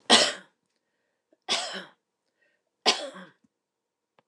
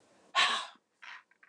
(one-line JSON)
{"three_cough_length": "4.3 s", "three_cough_amplitude": 24699, "three_cough_signal_mean_std_ratio": 0.27, "exhalation_length": "1.5 s", "exhalation_amplitude": 8012, "exhalation_signal_mean_std_ratio": 0.38, "survey_phase": "alpha (2021-03-01 to 2021-08-12)", "age": "65+", "gender": "Female", "wearing_mask": "No", "symptom_none": true, "smoker_status": "Never smoked", "respiratory_condition_asthma": false, "respiratory_condition_other": false, "recruitment_source": "REACT", "submission_delay": "1 day", "covid_test_result": "Negative", "covid_test_method": "RT-qPCR"}